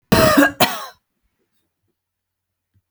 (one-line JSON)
{"cough_length": "2.9 s", "cough_amplitude": 32768, "cough_signal_mean_std_ratio": 0.35, "survey_phase": "beta (2021-08-13 to 2022-03-07)", "age": "45-64", "gender": "Female", "wearing_mask": "No", "symptom_none": true, "smoker_status": "Never smoked", "respiratory_condition_asthma": true, "respiratory_condition_other": false, "recruitment_source": "REACT", "submission_delay": "2 days", "covid_test_result": "Negative", "covid_test_method": "RT-qPCR"}